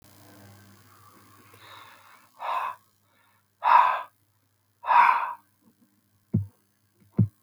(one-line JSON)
{"exhalation_length": "7.4 s", "exhalation_amplitude": 18098, "exhalation_signal_mean_std_ratio": 0.32, "survey_phase": "beta (2021-08-13 to 2022-03-07)", "age": "65+", "gender": "Male", "wearing_mask": "No", "symptom_none": true, "smoker_status": "Never smoked", "respiratory_condition_asthma": false, "respiratory_condition_other": false, "recruitment_source": "REACT", "submission_delay": "1 day", "covid_test_result": "Negative", "covid_test_method": "RT-qPCR"}